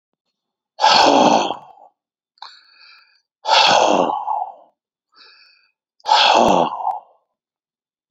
{
  "exhalation_length": "8.1 s",
  "exhalation_amplitude": 32344,
  "exhalation_signal_mean_std_ratio": 0.45,
  "survey_phase": "beta (2021-08-13 to 2022-03-07)",
  "age": "65+",
  "gender": "Male",
  "wearing_mask": "No",
  "symptom_headache": true,
  "symptom_onset": "12 days",
  "smoker_status": "Ex-smoker",
  "respiratory_condition_asthma": false,
  "respiratory_condition_other": false,
  "recruitment_source": "REACT",
  "submission_delay": "28 days",
  "covid_test_result": "Negative",
  "covid_test_method": "RT-qPCR",
  "influenza_a_test_result": "Negative",
  "influenza_b_test_result": "Negative"
}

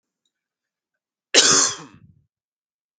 {
  "cough_length": "3.0 s",
  "cough_amplitude": 32768,
  "cough_signal_mean_std_ratio": 0.29,
  "survey_phase": "beta (2021-08-13 to 2022-03-07)",
  "age": "18-44",
  "gender": "Male",
  "wearing_mask": "No",
  "symptom_cough_any": true,
  "smoker_status": "Never smoked",
  "respiratory_condition_asthma": false,
  "respiratory_condition_other": false,
  "recruitment_source": "REACT",
  "submission_delay": "1 day",
  "covid_test_result": "Negative",
  "covid_test_method": "RT-qPCR"
}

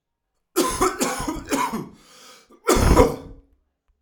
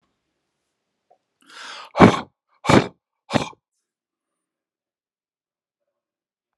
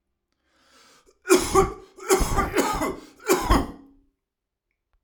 {
  "cough_length": "4.0 s",
  "cough_amplitude": 31280,
  "cough_signal_mean_std_ratio": 0.48,
  "exhalation_length": "6.6 s",
  "exhalation_amplitude": 32767,
  "exhalation_signal_mean_std_ratio": 0.19,
  "three_cough_length": "5.0 s",
  "three_cough_amplitude": 21685,
  "three_cough_signal_mean_std_ratio": 0.44,
  "survey_phase": "alpha (2021-03-01 to 2021-08-12)",
  "age": "45-64",
  "gender": "Male",
  "wearing_mask": "No",
  "symptom_none": true,
  "smoker_status": "Never smoked",
  "respiratory_condition_asthma": false,
  "respiratory_condition_other": false,
  "recruitment_source": "REACT",
  "submission_delay": "1 day",
  "covid_test_result": "Negative",
  "covid_test_method": "RT-qPCR"
}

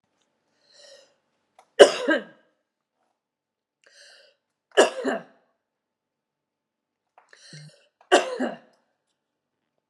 {
  "three_cough_length": "9.9 s",
  "three_cough_amplitude": 32768,
  "three_cough_signal_mean_std_ratio": 0.2,
  "survey_phase": "beta (2021-08-13 to 2022-03-07)",
  "age": "65+",
  "gender": "Female",
  "wearing_mask": "No",
  "symptom_runny_or_blocked_nose": true,
  "symptom_change_to_sense_of_smell_or_taste": true,
  "smoker_status": "Ex-smoker",
  "respiratory_condition_asthma": false,
  "respiratory_condition_other": false,
  "recruitment_source": "Test and Trace",
  "submission_delay": "2 days",
  "covid_test_result": "Positive",
  "covid_test_method": "RT-qPCR",
  "covid_ct_value": 32.8,
  "covid_ct_gene": "N gene",
  "covid_ct_mean": 33.2,
  "covid_viral_load": "13 copies/ml",
  "covid_viral_load_category": "Minimal viral load (< 10K copies/ml)"
}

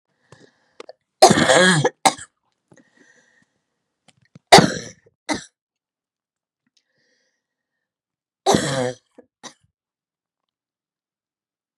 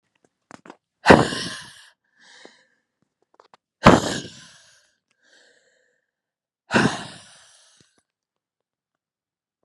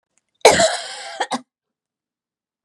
{
  "three_cough_length": "11.8 s",
  "three_cough_amplitude": 32768,
  "three_cough_signal_mean_std_ratio": 0.24,
  "exhalation_length": "9.6 s",
  "exhalation_amplitude": 32768,
  "exhalation_signal_mean_std_ratio": 0.21,
  "cough_length": "2.6 s",
  "cough_amplitude": 32768,
  "cough_signal_mean_std_ratio": 0.32,
  "survey_phase": "beta (2021-08-13 to 2022-03-07)",
  "age": "45-64",
  "gender": "Female",
  "wearing_mask": "No",
  "symptom_none": true,
  "smoker_status": "Ex-smoker",
  "respiratory_condition_asthma": false,
  "respiratory_condition_other": false,
  "recruitment_source": "Test and Trace",
  "submission_delay": "1 day",
  "covid_test_method": "ePCR"
}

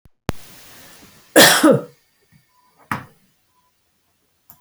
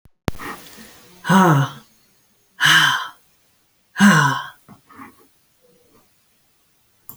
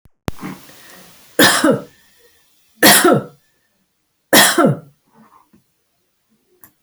{
  "cough_length": "4.6 s",
  "cough_amplitude": 32768,
  "cough_signal_mean_std_ratio": 0.28,
  "exhalation_length": "7.2 s",
  "exhalation_amplitude": 28472,
  "exhalation_signal_mean_std_ratio": 0.37,
  "three_cough_length": "6.8 s",
  "three_cough_amplitude": 32768,
  "three_cough_signal_mean_std_ratio": 0.36,
  "survey_phase": "beta (2021-08-13 to 2022-03-07)",
  "age": "65+",
  "gender": "Female",
  "wearing_mask": "No",
  "symptom_none": true,
  "smoker_status": "Ex-smoker",
  "respiratory_condition_asthma": false,
  "respiratory_condition_other": false,
  "recruitment_source": "REACT",
  "submission_delay": "1 day",
  "covid_test_result": "Negative",
  "covid_test_method": "RT-qPCR",
  "influenza_a_test_result": "Negative",
  "influenza_b_test_result": "Negative"
}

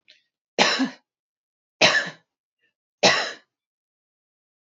{
  "three_cough_length": "4.6 s",
  "three_cough_amplitude": 27864,
  "three_cough_signal_mean_std_ratio": 0.32,
  "survey_phase": "beta (2021-08-13 to 2022-03-07)",
  "age": "45-64",
  "gender": "Female",
  "wearing_mask": "No",
  "symptom_cough_any": true,
  "symptom_runny_or_blocked_nose": true,
  "symptom_sore_throat": true,
  "smoker_status": "Never smoked",
  "respiratory_condition_asthma": false,
  "respiratory_condition_other": false,
  "recruitment_source": "REACT",
  "submission_delay": "6 days",
  "covid_test_result": "Negative",
  "covid_test_method": "RT-qPCR",
  "influenza_a_test_result": "Negative",
  "influenza_b_test_result": "Negative"
}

